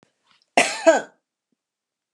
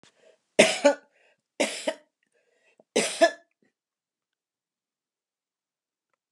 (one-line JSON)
{"cough_length": "2.1 s", "cough_amplitude": 29676, "cough_signal_mean_std_ratio": 0.28, "three_cough_length": "6.3 s", "three_cough_amplitude": 26146, "three_cough_signal_mean_std_ratio": 0.24, "survey_phase": "alpha (2021-03-01 to 2021-08-12)", "age": "65+", "gender": "Female", "wearing_mask": "No", "symptom_none": true, "smoker_status": "Ex-smoker", "respiratory_condition_asthma": false, "respiratory_condition_other": false, "recruitment_source": "REACT", "submission_delay": "1 day", "covid_test_result": "Negative", "covid_test_method": "RT-qPCR"}